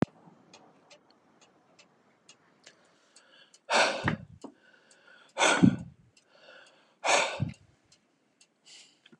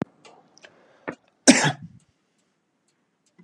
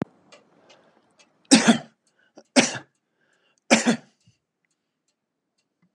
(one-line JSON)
{"exhalation_length": "9.2 s", "exhalation_amplitude": 14820, "exhalation_signal_mean_std_ratio": 0.29, "cough_length": "3.4 s", "cough_amplitude": 32487, "cough_signal_mean_std_ratio": 0.21, "three_cough_length": "5.9 s", "three_cough_amplitude": 29608, "three_cough_signal_mean_std_ratio": 0.25, "survey_phase": "beta (2021-08-13 to 2022-03-07)", "age": "45-64", "gender": "Male", "wearing_mask": "No", "symptom_none": true, "smoker_status": "Never smoked", "respiratory_condition_asthma": false, "respiratory_condition_other": false, "recruitment_source": "REACT", "submission_delay": "2 days", "covid_test_result": "Negative", "covid_test_method": "RT-qPCR", "influenza_a_test_result": "Negative", "influenza_b_test_result": "Negative"}